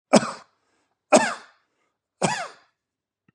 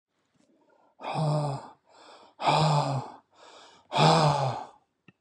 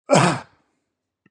{"three_cough_length": "3.3 s", "three_cough_amplitude": 29061, "three_cough_signal_mean_std_ratio": 0.27, "exhalation_length": "5.2 s", "exhalation_amplitude": 13239, "exhalation_signal_mean_std_ratio": 0.51, "cough_length": "1.3 s", "cough_amplitude": 28726, "cough_signal_mean_std_ratio": 0.37, "survey_phase": "beta (2021-08-13 to 2022-03-07)", "age": "65+", "gender": "Male", "wearing_mask": "No", "symptom_none": true, "smoker_status": "Never smoked", "respiratory_condition_asthma": false, "respiratory_condition_other": false, "recruitment_source": "REACT", "submission_delay": "0 days", "covid_test_result": "Negative", "covid_test_method": "RT-qPCR", "influenza_a_test_result": "Negative", "influenza_b_test_result": "Negative"}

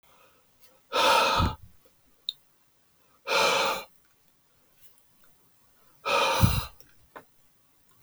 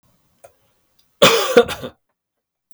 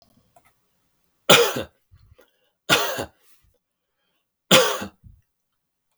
{"exhalation_length": "8.0 s", "exhalation_amplitude": 17071, "exhalation_signal_mean_std_ratio": 0.4, "cough_length": "2.7 s", "cough_amplitude": 32767, "cough_signal_mean_std_ratio": 0.31, "three_cough_length": "6.0 s", "three_cough_amplitude": 32768, "three_cough_signal_mean_std_ratio": 0.28, "survey_phase": "beta (2021-08-13 to 2022-03-07)", "age": "45-64", "gender": "Male", "wearing_mask": "No", "symptom_none": true, "smoker_status": "Never smoked", "respiratory_condition_asthma": false, "respiratory_condition_other": false, "recruitment_source": "REACT", "submission_delay": "1 day", "covid_test_result": "Negative", "covid_test_method": "RT-qPCR"}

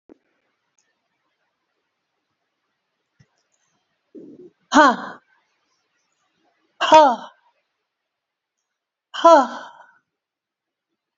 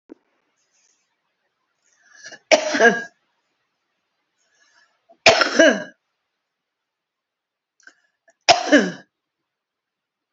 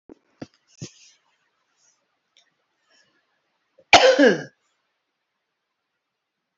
{"exhalation_length": "11.2 s", "exhalation_amplitude": 29114, "exhalation_signal_mean_std_ratio": 0.21, "three_cough_length": "10.3 s", "three_cough_amplitude": 31913, "three_cough_signal_mean_std_ratio": 0.26, "cough_length": "6.6 s", "cough_amplitude": 31178, "cough_signal_mean_std_ratio": 0.21, "survey_phase": "beta (2021-08-13 to 2022-03-07)", "age": "65+", "gender": "Female", "wearing_mask": "No", "symptom_none": true, "smoker_status": "Current smoker (11 or more cigarettes per day)", "respiratory_condition_asthma": false, "respiratory_condition_other": true, "recruitment_source": "REACT", "submission_delay": "2 days", "covid_test_result": "Negative", "covid_test_method": "RT-qPCR"}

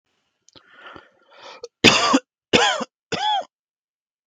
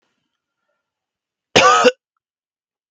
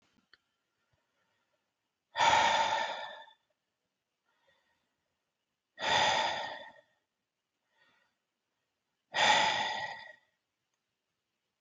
{"three_cough_length": "4.3 s", "three_cough_amplitude": 32768, "three_cough_signal_mean_std_ratio": 0.36, "cough_length": "2.9 s", "cough_amplitude": 32768, "cough_signal_mean_std_ratio": 0.28, "exhalation_length": "11.6 s", "exhalation_amplitude": 6487, "exhalation_signal_mean_std_ratio": 0.36, "survey_phase": "beta (2021-08-13 to 2022-03-07)", "age": "18-44", "gender": "Male", "wearing_mask": "No", "symptom_cough_any": true, "smoker_status": "Ex-smoker", "respiratory_condition_asthma": false, "respiratory_condition_other": false, "recruitment_source": "REACT", "submission_delay": "4 days", "covid_test_result": "Negative", "covid_test_method": "RT-qPCR", "influenza_a_test_result": "Negative", "influenza_b_test_result": "Negative"}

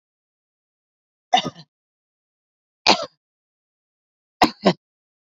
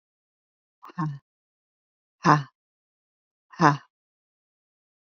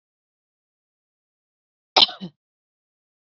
{"three_cough_length": "5.3 s", "three_cough_amplitude": 28462, "three_cough_signal_mean_std_ratio": 0.2, "exhalation_length": "5.0 s", "exhalation_amplitude": 23162, "exhalation_signal_mean_std_ratio": 0.21, "cough_length": "3.2 s", "cough_amplitude": 28648, "cough_signal_mean_std_ratio": 0.14, "survey_phase": "beta (2021-08-13 to 2022-03-07)", "age": "45-64", "gender": "Female", "wearing_mask": "No", "symptom_none": true, "smoker_status": "Never smoked", "respiratory_condition_asthma": false, "respiratory_condition_other": false, "recruitment_source": "REACT", "submission_delay": "2 days", "covid_test_result": "Negative", "covid_test_method": "RT-qPCR", "influenza_a_test_result": "Negative", "influenza_b_test_result": "Negative"}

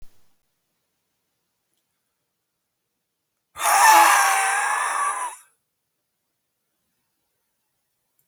{"cough_length": "8.3 s", "cough_amplitude": 26576, "cough_signal_mean_std_ratio": 0.34, "survey_phase": "beta (2021-08-13 to 2022-03-07)", "age": "65+", "gender": "Male", "wearing_mask": "No", "symptom_cough_any": true, "symptom_runny_or_blocked_nose": true, "symptom_shortness_of_breath": true, "symptom_fatigue": true, "symptom_headache": true, "symptom_other": true, "symptom_onset": "10 days", "smoker_status": "Current smoker (1 to 10 cigarettes per day)", "respiratory_condition_asthma": false, "respiratory_condition_other": true, "recruitment_source": "REACT", "submission_delay": "1 day", "covid_test_result": "Negative", "covid_test_method": "RT-qPCR"}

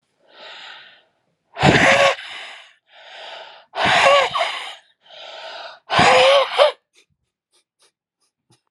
{"exhalation_length": "8.7 s", "exhalation_amplitude": 32767, "exhalation_signal_mean_std_ratio": 0.44, "survey_phase": "alpha (2021-03-01 to 2021-08-12)", "age": "45-64", "gender": "Male", "wearing_mask": "No", "symptom_cough_any": true, "symptom_fever_high_temperature": true, "symptom_change_to_sense_of_smell_or_taste": true, "symptom_loss_of_taste": true, "symptom_onset": "4 days", "smoker_status": "Never smoked", "respiratory_condition_asthma": false, "respiratory_condition_other": false, "recruitment_source": "Test and Trace", "submission_delay": "1 day", "covid_test_result": "Positive", "covid_test_method": "RT-qPCR", "covid_ct_value": 13.0, "covid_ct_gene": "N gene", "covid_ct_mean": 13.6, "covid_viral_load": "35000000 copies/ml", "covid_viral_load_category": "High viral load (>1M copies/ml)"}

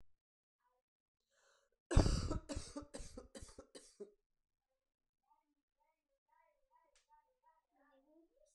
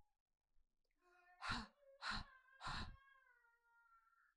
{"cough_length": "8.5 s", "cough_amplitude": 5498, "cough_signal_mean_std_ratio": 0.21, "exhalation_length": "4.4 s", "exhalation_amplitude": 905, "exhalation_signal_mean_std_ratio": 0.4, "survey_phase": "alpha (2021-03-01 to 2021-08-12)", "age": "18-44", "gender": "Female", "wearing_mask": "No", "symptom_cough_any": true, "symptom_headache": true, "symptom_change_to_sense_of_smell_or_taste": true, "symptom_onset": "7 days", "smoker_status": "Current smoker (e-cigarettes or vapes only)", "respiratory_condition_asthma": false, "respiratory_condition_other": false, "recruitment_source": "Test and Trace", "submission_delay": "2 days", "covid_test_result": "Positive", "covid_test_method": "RT-qPCR", "covid_ct_value": 17.2, "covid_ct_gene": "N gene", "covid_ct_mean": 18.0, "covid_viral_load": "1200000 copies/ml", "covid_viral_load_category": "High viral load (>1M copies/ml)"}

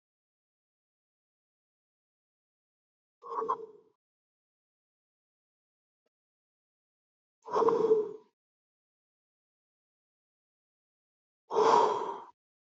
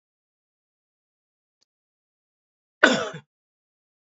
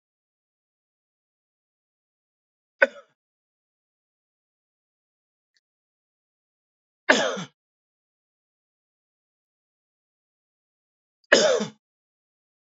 {"exhalation_length": "12.8 s", "exhalation_amplitude": 9441, "exhalation_signal_mean_std_ratio": 0.26, "cough_length": "4.2 s", "cough_amplitude": 27774, "cough_signal_mean_std_ratio": 0.16, "three_cough_length": "12.6 s", "three_cough_amplitude": 27983, "three_cough_signal_mean_std_ratio": 0.16, "survey_phase": "beta (2021-08-13 to 2022-03-07)", "age": "18-44", "gender": "Male", "wearing_mask": "No", "symptom_none": true, "smoker_status": "Never smoked", "respiratory_condition_asthma": false, "respiratory_condition_other": false, "recruitment_source": "REACT", "submission_delay": "2 days", "covid_test_result": "Negative", "covid_test_method": "RT-qPCR"}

